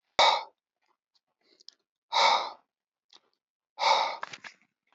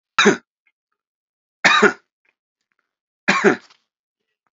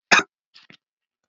exhalation_length: 4.9 s
exhalation_amplitude: 11810
exhalation_signal_mean_std_ratio: 0.34
three_cough_length: 4.5 s
three_cough_amplitude: 30014
three_cough_signal_mean_std_ratio: 0.3
cough_length: 1.3 s
cough_amplitude: 30063
cough_signal_mean_std_ratio: 0.22
survey_phase: alpha (2021-03-01 to 2021-08-12)
age: 45-64
gender: Male
wearing_mask: 'No'
symptom_none: true
smoker_status: Never smoked
respiratory_condition_asthma: false
respiratory_condition_other: false
recruitment_source: REACT
submission_delay: 4 days
covid_test_result: Negative
covid_test_method: RT-qPCR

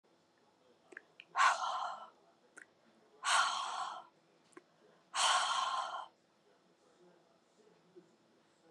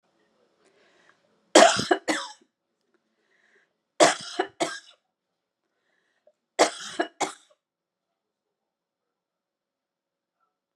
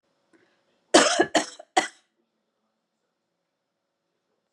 exhalation_length: 8.7 s
exhalation_amplitude: 4718
exhalation_signal_mean_std_ratio: 0.4
three_cough_length: 10.8 s
three_cough_amplitude: 30397
three_cough_signal_mean_std_ratio: 0.22
cough_length: 4.5 s
cough_amplitude: 27662
cough_signal_mean_std_ratio: 0.24
survey_phase: beta (2021-08-13 to 2022-03-07)
age: 45-64
gender: Female
wearing_mask: 'No'
symptom_none: true
smoker_status: Never smoked
respiratory_condition_asthma: false
respiratory_condition_other: false
recruitment_source: REACT
submission_delay: 1 day
covid_test_result: Negative
covid_test_method: RT-qPCR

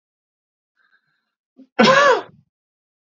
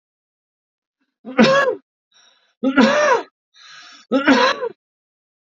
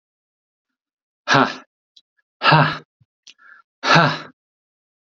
cough_length: 3.2 s
cough_amplitude: 27263
cough_signal_mean_std_ratio: 0.29
three_cough_length: 5.5 s
three_cough_amplitude: 32767
three_cough_signal_mean_std_ratio: 0.43
exhalation_length: 5.1 s
exhalation_amplitude: 30631
exhalation_signal_mean_std_ratio: 0.32
survey_phase: beta (2021-08-13 to 2022-03-07)
age: 18-44
gender: Male
wearing_mask: 'No'
symptom_none: true
smoker_status: Never smoked
respiratory_condition_asthma: false
respiratory_condition_other: false
recruitment_source: REACT
submission_delay: 1 day
covid_test_result: Negative
covid_test_method: RT-qPCR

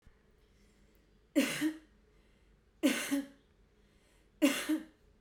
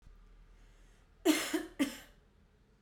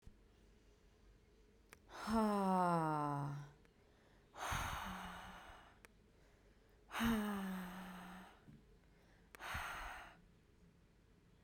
three_cough_length: 5.2 s
three_cough_amplitude: 5238
three_cough_signal_mean_std_ratio: 0.38
cough_length: 2.8 s
cough_amplitude: 5356
cough_signal_mean_std_ratio: 0.36
exhalation_length: 11.4 s
exhalation_amplitude: 1707
exhalation_signal_mean_std_ratio: 0.5
survey_phase: beta (2021-08-13 to 2022-03-07)
age: 18-44
gender: Female
wearing_mask: 'No'
symptom_none: true
smoker_status: Never smoked
respiratory_condition_asthma: false
respiratory_condition_other: false
recruitment_source: REACT
submission_delay: 1 day
covid_test_result: Negative
covid_test_method: RT-qPCR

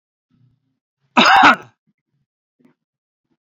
cough_length: 3.4 s
cough_amplitude: 31156
cough_signal_mean_std_ratio: 0.28
survey_phase: beta (2021-08-13 to 2022-03-07)
age: 65+
gender: Male
wearing_mask: 'No'
symptom_none: true
smoker_status: Ex-smoker
respiratory_condition_asthma: false
respiratory_condition_other: false
recruitment_source: REACT
submission_delay: 1 day
covid_test_result: Negative
covid_test_method: RT-qPCR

